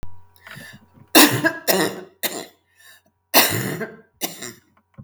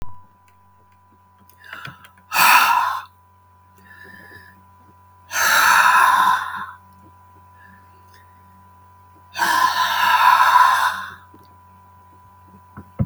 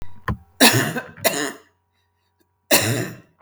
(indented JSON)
{
  "three_cough_length": "5.0 s",
  "three_cough_amplitude": 32768,
  "three_cough_signal_mean_std_ratio": 0.39,
  "exhalation_length": "13.1 s",
  "exhalation_amplitude": 32766,
  "exhalation_signal_mean_std_ratio": 0.47,
  "cough_length": "3.4 s",
  "cough_amplitude": 32768,
  "cough_signal_mean_std_ratio": 0.44,
  "survey_phase": "beta (2021-08-13 to 2022-03-07)",
  "age": "65+",
  "gender": "Female",
  "wearing_mask": "No",
  "symptom_runny_or_blocked_nose": true,
  "symptom_sore_throat": true,
  "symptom_onset": "5 days",
  "smoker_status": "Ex-smoker",
  "respiratory_condition_asthma": false,
  "respiratory_condition_other": false,
  "recruitment_source": "Test and Trace",
  "submission_delay": "2 days",
  "covid_test_result": "Positive",
  "covid_test_method": "RT-qPCR",
  "covid_ct_value": 18.4,
  "covid_ct_gene": "N gene",
  "covid_ct_mean": 19.0,
  "covid_viral_load": "570000 copies/ml",
  "covid_viral_load_category": "Low viral load (10K-1M copies/ml)"
}